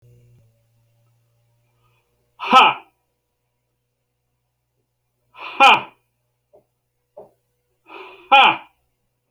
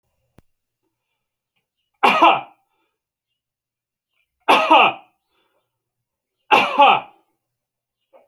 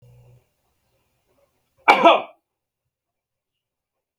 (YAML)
exhalation_length: 9.3 s
exhalation_amplitude: 31197
exhalation_signal_mean_std_ratio: 0.23
three_cough_length: 8.3 s
three_cough_amplitude: 32767
three_cough_signal_mean_std_ratio: 0.3
cough_length: 4.2 s
cough_amplitude: 32767
cough_signal_mean_std_ratio: 0.21
survey_phase: alpha (2021-03-01 to 2021-08-12)
age: 45-64
gender: Male
wearing_mask: 'No'
symptom_shortness_of_breath: true
symptom_fatigue: true
smoker_status: Ex-smoker
respiratory_condition_asthma: false
respiratory_condition_other: false
recruitment_source: REACT
submission_delay: 1 day
covid_test_result: Negative
covid_test_method: RT-qPCR